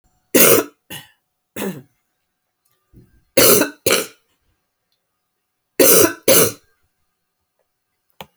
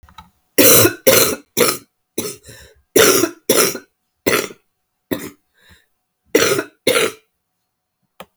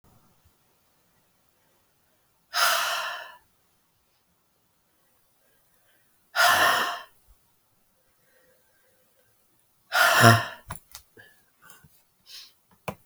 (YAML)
three_cough_length: 8.4 s
three_cough_amplitude: 32768
three_cough_signal_mean_std_ratio: 0.33
cough_length: 8.4 s
cough_amplitude: 32768
cough_signal_mean_std_ratio: 0.41
exhalation_length: 13.1 s
exhalation_amplitude: 28849
exhalation_signal_mean_std_ratio: 0.29
survey_phase: alpha (2021-03-01 to 2021-08-12)
age: 45-64
gender: Female
wearing_mask: 'No'
symptom_cough_any: true
symptom_shortness_of_breath: true
symptom_fatigue: true
symptom_fever_high_temperature: true
symptom_change_to_sense_of_smell_or_taste: true
symptom_loss_of_taste: true
symptom_onset: 3 days
smoker_status: Never smoked
respiratory_condition_asthma: false
respiratory_condition_other: false
recruitment_source: Test and Trace
submission_delay: 2 days
covid_test_result: Positive
covid_test_method: RT-qPCR
covid_ct_value: 26.4
covid_ct_gene: ORF1ab gene